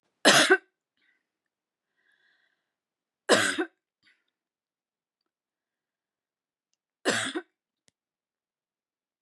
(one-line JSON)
{"three_cough_length": "9.2 s", "three_cough_amplitude": 18871, "three_cough_signal_mean_std_ratio": 0.23, "survey_phase": "beta (2021-08-13 to 2022-03-07)", "age": "18-44", "gender": "Female", "wearing_mask": "No", "symptom_none": true, "smoker_status": "Never smoked", "respiratory_condition_asthma": false, "respiratory_condition_other": false, "recruitment_source": "REACT", "submission_delay": "1 day", "covid_test_result": "Negative", "covid_test_method": "RT-qPCR", "influenza_a_test_result": "Negative", "influenza_b_test_result": "Negative"}